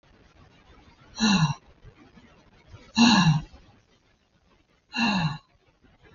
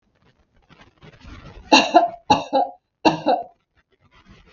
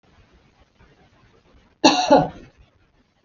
{"exhalation_length": "6.1 s", "exhalation_amplitude": 15285, "exhalation_signal_mean_std_ratio": 0.38, "three_cough_length": "4.5 s", "three_cough_amplitude": 32768, "three_cough_signal_mean_std_ratio": 0.34, "cough_length": "3.2 s", "cough_amplitude": 32768, "cough_signal_mean_std_ratio": 0.28, "survey_phase": "beta (2021-08-13 to 2022-03-07)", "age": "45-64", "gender": "Female", "wearing_mask": "No", "symptom_none": true, "symptom_onset": "3 days", "smoker_status": "Ex-smoker", "respiratory_condition_asthma": false, "respiratory_condition_other": false, "recruitment_source": "REACT", "submission_delay": "2 days", "covid_test_result": "Negative", "covid_test_method": "RT-qPCR", "influenza_a_test_result": "Unknown/Void", "influenza_b_test_result": "Unknown/Void"}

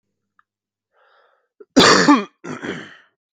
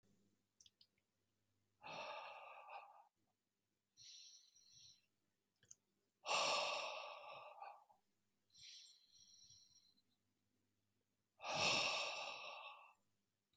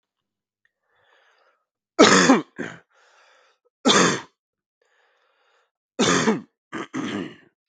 {"cough_length": "3.3 s", "cough_amplitude": 32768, "cough_signal_mean_std_ratio": 0.33, "exhalation_length": "13.6 s", "exhalation_amplitude": 1640, "exhalation_signal_mean_std_ratio": 0.38, "three_cough_length": "7.7 s", "three_cough_amplitude": 32768, "three_cough_signal_mean_std_ratio": 0.33, "survey_phase": "beta (2021-08-13 to 2022-03-07)", "age": "18-44", "gender": "Male", "wearing_mask": "No", "symptom_cough_any": true, "symptom_change_to_sense_of_smell_or_taste": true, "symptom_onset": "3 days", "smoker_status": "Never smoked", "respiratory_condition_asthma": false, "respiratory_condition_other": false, "recruitment_source": "Test and Trace", "submission_delay": "1 day", "covid_test_result": "Positive", "covid_test_method": "RT-qPCR"}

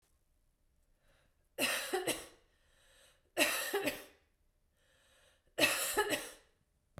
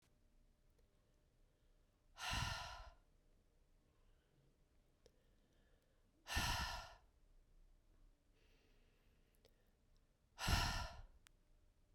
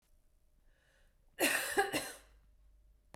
{"three_cough_length": "7.0 s", "three_cough_amplitude": 6886, "three_cough_signal_mean_std_ratio": 0.41, "exhalation_length": "11.9 s", "exhalation_amplitude": 1804, "exhalation_signal_mean_std_ratio": 0.34, "cough_length": "3.2 s", "cough_amplitude": 4237, "cough_signal_mean_std_ratio": 0.37, "survey_phase": "beta (2021-08-13 to 2022-03-07)", "age": "45-64", "gender": "Female", "wearing_mask": "No", "symptom_none": true, "smoker_status": "Never smoked", "respiratory_condition_asthma": false, "respiratory_condition_other": false, "recruitment_source": "REACT", "submission_delay": "3 days", "covid_test_result": "Negative", "covid_test_method": "RT-qPCR", "influenza_a_test_result": "Negative", "influenza_b_test_result": "Negative"}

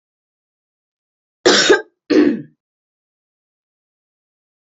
{"cough_length": "4.6 s", "cough_amplitude": 31025, "cough_signal_mean_std_ratio": 0.29, "survey_phase": "beta (2021-08-13 to 2022-03-07)", "age": "18-44", "gender": "Female", "wearing_mask": "No", "symptom_runny_or_blocked_nose": true, "symptom_sore_throat": true, "symptom_fatigue": true, "symptom_other": true, "symptom_onset": "3 days", "smoker_status": "Never smoked", "respiratory_condition_asthma": false, "respiratory_condition_other": false, "recruitment_source": "Test and Trace", "submission_delay": "2 days", "covid_test_result": "Positive", "covid_test_method": "RT-qPCR", "covid_ct_value": 25.7, "covid_ct_gene": "N gene", "covid_ct_mean": 25.7, "covid_viral_load": "3600 copies/ml", "covid_viral_load_category": "Minimal viral load (< 10K copies/ml)"}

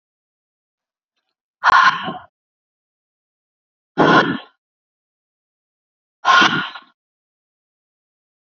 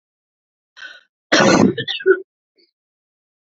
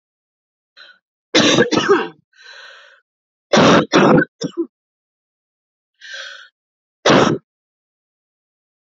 {"exhalation_length": "8.4 s", "exhalation_amplitude": 32680, "exhalation_signal_mean_std_ratio": 0.29, "cough_length": "3.4 s", "cough_amplitude": 32768, "cough_signal_mean_std_ratio": 0.36, "three_cough_length": "9.0 s", "three_cough_amplitude": 29800, "three_cough_signal_mean_std_ratio": 0.37, "survey_phase": "beta (2021-08-13 to 2022-03-07)", "age": "18-44", "gender": "Female", "wearing_mask": "No", "symptom_cough_any": true, "symptom_runny_or_blocked_nose": true, "symptom_shortness_of_breath": true, "symptom_fatigue": true, "symptom_fever_high_temperature": true, "symptom_headache": true, "symptom_other": true, "smoker_status": "Ex-smoker", "respiratory_condition_asthma": true, "respiratory_condition_other": false, "recruitment_source": "Test and Trace", "submission_delay": "0 days", "covid_test_result": "Positive", "covid_test_method": "LFT"}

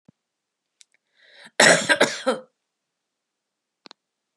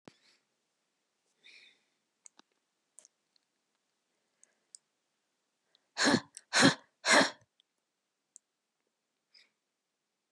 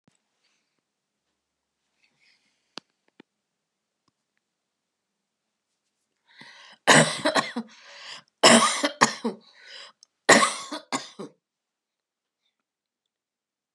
{"cough_length": "4.4 s", "cough_amplitude": 29641, "cough_signal_mean_std_ratio": 0.26, "exhalation_length": "10.3 s", "exhalation_amplitude": 9877, "exhalation_signal_mean_std_ratio": 0.2, "three_cough_length": "13.7 s", "three_cough_amplitude": 30576, "three_cough_signal_mean_std_ratio": 0.24, "survey_phase": "beta (2021-08-13 to 2022-03-07)", "age": "65+", "gender": "Female", "wearing_mask": "No", "symptom_cough_any": true, "symptom_runny_or_blocked_nose": true, "symptom_sore_throat": true, "symptom_onset": "3 days", "smoker_status": "Never smoked", "respiratory_condition_asthma": false, "respiratory_condition_other": false, "recruitment_source": "Test and Trace", "submission_delay": "2 days", "covid_test_result": "Positive", "covid_test_method": "RT-qPCR", "covid_ct_value": 18.7, "covid_ct_gene": "N gene", "covid_ct_mean": 18.8, "covid_viral_load": "690000 copies/ml", "covid_viral_load_category": "Low viral load (10K-1M copies/ml)"}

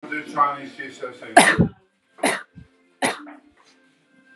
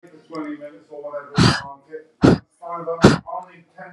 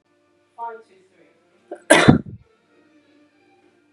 {"three_cough_length": "4.4 s", "three_cough_amplitude": 32767, "three_cough_signal_mean_std_ratio": 0.37, "exhalation_length": "3.9 s", "exhalation_amplitude": 32768, "exhalation_signal_mean_std_ratio": 0.4, "cough_length": "3.9 s", "cough_amplitude": 32768, "cough_signal_mean_std_ratio": 0.23, "survey_phase": "beta (2021-08-13 to 2022-03-07)", "age": "18-44", "gender": "Female", "wearing_mask": "No", "symptom_none": true, "smoker_status": "Never smoked", "respiratory_condition_asthma": false, "respiratory_condition_other": false, "recruitment_source": "REACT", "submission_delay": "6 days", "covid_test_result": "Negative", "covid_test_method": "RT-qPCR", "influenza_a_test_result": "Negative", "influenza_b_test_result": "Negative"}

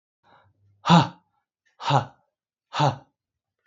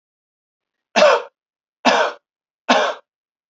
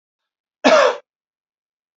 {"exhalation_length": "3.7 s", "exhalation_amplitude": 26142, "exhalation_signal_mean_std_ratio": 0.29, "three_cough_length": "3.5 s", "three_cough_amplitude": 29755, "three_cough_signal_mean_std_ratio": 0.37, "cough_length": "2.0 s", "cough_amplitude": 32741, "cough_signal_mean_std_ratio": 0.32, "survey_phase": "beta (2021-08-13 to 2022-03-07)", "age": "45-64", "gender": "Male", "wearing_mask": "No", "symptom_none": true, "smoker_status": "Ex-smoker", "respiratory_condition_asthma": false, "respiratory_condition_other": false, "recruitment_source": "REACT", "submission_delay": "1 day", "covid_test_result": "Negative", "covid_test_method": "RT-qPCR"}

